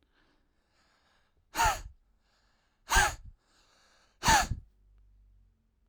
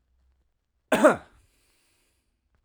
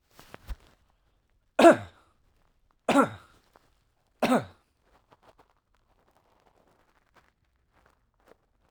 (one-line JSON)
{"exhalation_length": "5.9 s", "exhalation_amplitude": 10612, "exhalation_signal_mean_std_ratio": 0.29, "cough_length": "2.6 s", "cough_amplitude": 19087, "cough_signal_mean_std_ratio": 0.22, "three_cough_length": "8.7 s", "three_cough_amplitude": 18204, "three_cough_signal_mean_std_ratio": 0.2, "survey_phase": "alpha (2021-03-01 to 2021-08-12)", "age": "18-44", "gender": "Male", "wearing_mask": "No", "symptom_none": true, "smoker_status": "Never smoked", "respiratory_condition_asthma": false, "respiratory_condition_other": false, "recruitment_source": "REACT", "submission_delay": "1 day", "covid_test_result": "Negative", "covid_test_method": "RT-qPCR"}